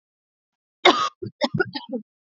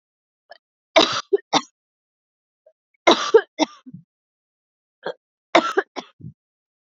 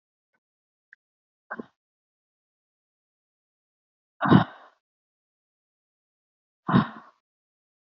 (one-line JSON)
{"cough_length": "2.2 s", "cough_amplitude": 31316, "cough_signal_mean_std_ratio": 0.34, "three_cough_length": "6.9 s", "three_cough_amplitude": 29908, "three_cough_signal_mean_std_ratio": 0.26, "exhalation_length": "7.9 s", "exhalation_amplitude": 23353, "exhalation_signal_mean_std_ratio": 0.17, "survey_phase": "beta (2021-08-13 to 2022-03-07)", "age": "18-44", "gender": "Female", "wearing_mask": "No", "symptom_none": true, "smoker_status": "Never smoked", "respiratory_condition_asthma": false, "respiratory_condition_other": false, "recruitment_source": "REACT", "submission_delay": "2 days", "covid_test_result": "Negative", "covid_test_method": "RT-qPCR", "influenza_a_test_result": "Negative", "influenza_b_test_result": "Negative"}